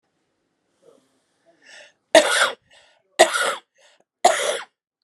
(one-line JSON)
{"three_cough_length": "5.0 s", "three_cough_amplitude": 32721, "three_cough_signal_mean_std_ratio": 0.31, "survey_phase": "beta (2021-08-13 to 2022-03-07)", "age": "18-44", "gender": "Female", "wearing_mask": "No", "symptom_cough_any": true, "symptom_runny_or_blocked_nose": true, "symptom_sore_throat": true, "symptom_abdominal_pain": true, "symptom_diarrhoea": true, "symptom_fatigue": true, "symptom_fever_high_temperature": true, "symptom_loss_of_taste": true, "symptom_onset": "6 days", "smoker_status": "Ex-smoker", "respiratory_condition_asthma": false, "respiratory_condition_other": false, "recruitment_source": "Test and Trace", "submission_delay": "1 day", "covid_test_result": "Positive", "covid_test_method": "RT-qPCR", "covid_ct_value": 16.2, "covid_ct_gene": "N gene", "covid_ct_mean": 16.5, "covid_viral_load": "3900000 copies/ml", "covid_viral_load_category": "High viral load (>1M copies/ml)"}